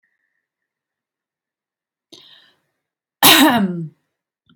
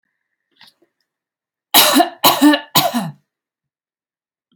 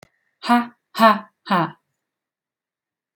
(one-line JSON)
{"cough_length": "4.6 s", "cough_amplitude": 32768, "cough_signal_mean_std_ratio": 0.28, "three_cough_length": "4.6 s", "three_cough_amplitude": 32768, "three_cough_signal_mean_std_ratio": 0.36, "exhalation_length": "3.2 s", "exhalation_amplitude": 27908, "exhalation_signal_mean_std_ratio": 0.32, "survey_phase": "alpha (2021-03-01 to 2021-08-12)", "age": "18-44", "gender": "Female", "wearing_mask": "No", "symptom_headache": true, "symptom_onset": "13 days", "smoker_status": "Never smoked", "respiratory_condition_asthma": false, "respiratory_condition_other": false, "recruitment_source": "REACT", "submission_delay": "1 day", "covid_test_result": "Negative", "covid_test_method": "RT-qPCR"}